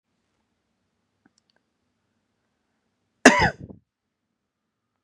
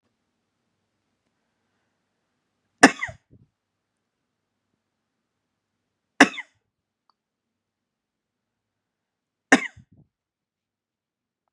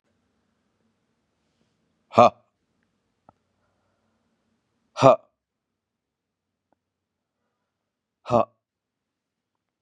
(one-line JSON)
{"cough_length": "5.0 s", "cough_amplitude": 32768, "cough_signal_mean_std_ratio": 0.15, "three_cough_length": "11.5 s", "three_cough_amplitude": 32768, "three_cough_signal_mean_std_ratio": 0.11, "exhalation_length": "9.8 s", "exhalation_amplitude": 32382, "exhalation_signal_mean_std_ratio": 0.14, "survey_phase": "beta (2021-08-13 to 2022-03-07)", "age": "45-64", "gender": "Male", "wearing_mask": "No", "symptom_new_continuous_cough": true, "symptom_runny_or_blocked_nose": true, "symptom_shortness_of_breath": true, "symptom_sore_throat": true, "symptom_fatigue": true, "symptom_fever_high_temperature": true, "symptom_headache": true, "symptom_change_to_sense_of_smell_or_taste": true, "symptom_loss_of_taste": true, "symptom_onset": "3 days", "smoker_status": "Never smoked", "respiratory_condition_asthma": false, "respiratory_condition_other": false, "recruitment_source": "Test and Trace", "submission_delay": "2 days", "covid_test_result": "Positive", "covid_test_method": "RT-qPCR"}